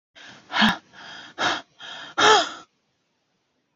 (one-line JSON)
{"exhalation_length": "3.8 s", "exhalation_amplitude": 22830, "exhalation_signal_mean_std_ratio": 0.38, "survey_phase": "beta (2021-08-13 to 2022-03-07)", "age": "45-64", "gender": "Female", "wearing_mask": "No", "symptom_none": true, "smoker_status": "Ex-smoker", "respiratory_condition_asthma": false, "respiratory_condition_other": false, "recruitment_source": "REACT", "submission_delay": "19 days", "covid_test_result": "Negative", "covid_test_method": "RT-qPCR", "influenza_a_test_result": "Negative", "influenza_b_test_result": "Negative"}